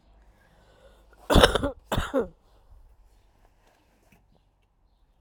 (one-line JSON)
{"cough_length": "5.2 s", "cough_amplitude": 30093, "cough_signal_mean_std_ratio": 0.26, "survey_phase": "alpha (2021-03-01 to 2021-08-12)", "age": "45-64", "gender": "Female", "wearing_mask": "No", "symptom_cough_any": true, "symptom_diarrhoea": true, "symptom_fatigue": true, "symptom_change_to_sense_of_smell_or_taste": true, "symptom_loss_of_taste": true, "smoker_status": "Ex-smoker", "respiratory_condition_asthma": false, "respiratory_condition_other": false, "recruitment_source": "Test and Trace", "submission_delay": "0 days", "covid_test_result": "Negative", "covid_test_method": "LFT"}